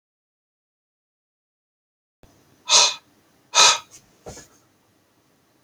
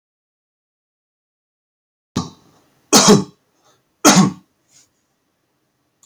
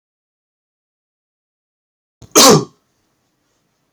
{"exhalation_length": "5.6 s", "exhalation_amplitude": 29854, "exhalation_signal_mean_std_ratio": 0.23, "three_cough_length": "6.1 s", "three_cough_amplitude": 32768, "three_cough_signal_mean_std_ratio": 0.26, "cough_length": "3.9 s", "cough_amplitude": 32768, "cough_signal_mean_std_ratio": 0.23, "survey_phase": "alpha (2021-03-01 to 2021-08-12)", "age": "18-44", "gender": "Male", "wearing_mask": "No", "symptom_none": true, "smoker_status": "Never smoked", "respiratory_condition_asthma": false, "respiratory_condition_other": false, "recruitment_source": "REACT", "submission_delay": "2 days", "covid_test_result": "Negative", "covid_test_method": "RT-qPCR"}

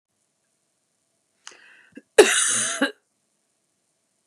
{"cough_length": "4.3 s", "cough_amplitude": 32768, "cough_signal_mean_std_ratio": 0.26, "survey_phase": "beta (2021-08-13 to 2022-03-07)", "age": "45-64", "gender": "Female", "wearing_mask": "No", "symptom_none": true, "smoker_status": "Never smoked", "respiratory_condition_asthma": false, "respiratory_condition_other": false, "recruitment_source": "REACT", "submission_delay": "2 days", "covid_test_result": "Negative", "covid_test_method": "RT-qPCR", "influenza_a_test_result": "Negative", "influenza_b_test_result": "Negative"}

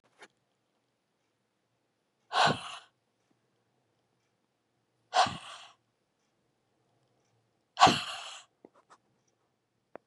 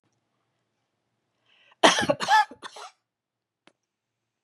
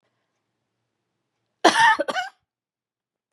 {"exhalation_length": "10.1 s", "exhalation_amplitude": 16549, "exhalation_signal_mean_std_ratio": 0.21, "three_cough_length": "4.4 s", "three_cough_amplitude": 26928, "three_cough_signal_mean_std_ratio": 0.25, "cough_length": "3.3 s", "cough_amplitude": 27070, "cough_signal_mean_std_ratio": 0.28, "survey_phase": "beta (2021-08-13 to 2022-03-07)", "age": "45-64", "gender": "Female", "wearing_mask": "No", "symptom_none": true, "symptom_onset": "9 days", "smoker_status": "Never smoked", "respiratory_condition_asthma": false, "respiratory_condition_other": false, "recruitment_source": "REACT", "submission_delay": "2 days", "covid_test_result": "Negative", "covid_test_method": "RT-qPCR", "influenza_a_test_result": "Negative", "influenza_b_test_result": "Negative"}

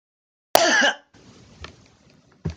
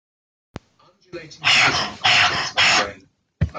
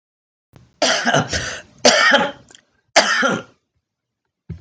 {"cough_length": "2.6 s", "cough_amplitude": 32766, "cough_signal_mean_std_ratio": 0.35, "exhalation_length": "3.6 s", "exhalation_amplitude": 25221, "exhalation_signal_mean_std_ratio": 0.53, "three_cough_length": "4.6 s", "three_cough_amplitude": 32768, "three_cough_signal_mean_std_ratio": 0.46, "survey_phase": "beta (2021-08-13 to 2022-03-07)", "age": "65+", "gender": "Female", "wearing_mask": "No", "symptom_none": true, "smoker_status": "Current smoker (11 or more cigarettes per day)", "respiratory_condition_asthma": false, "respiratory_condition_other": false, "recruitment_source": "REACT", "submission_delay": "7 days", "covid_test_result": "Negative", "covid_test_method": "RT-qPCR"}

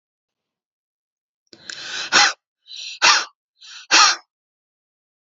{"exhalation_length": "5.3 s", "exhalation_amplitude": 30316, "exhalation_signal_mean_std_ratio": 0.31, "survey_phase": "beta (2021-08-13 to 2022-03-07)", "age": "18-44", "gender": "Female", "wearing_mask": "No", "symptom_none": true, "symptom_onset": "12 days", "smoker_status": "Never smoked", "respiratory_condition_asthma": true, "respiratory_condition_other": false, "recruitment_source": "REACT", "submission_delay": "2 days", "covid_test_result": "Negative", "covid_test_method": "RT-qPCR", "influenza_a_test_result": "Negative", "influenza_b_test_result": "Negative"}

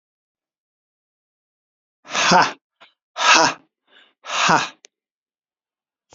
{"exhalation_length": "6.1 s", "exhalation_amplitude": 30443, "exhalation_signal_mean_std_ratio": 0.32, "survey_phase": "beta (2021-08-13 to 2022-03-07)", "age": "45-64", "gender": "Male", "wearing_mask": "No", "symptom_runny_or_blocked_nose": true, "symptom_fatigue": true, "smoker_status": "Never smoked", "respiratory_condition_asthma": false, "respiratory_condition_other": false, "recruitment_source": "Test and Trace", "submission_delay": "2 days", "covid_test_result": "Positive", "covid_test_method": "RT-qPCR", "covid_ct_value": 18.8, "covid_ct_gene": "ORF1ab gene", "covid_ct_mean": 19.0, "covid_viral_load": "580000 copies/ml", "covid_viral_load_category": "Low viral load (10K-1M copies/ml)"}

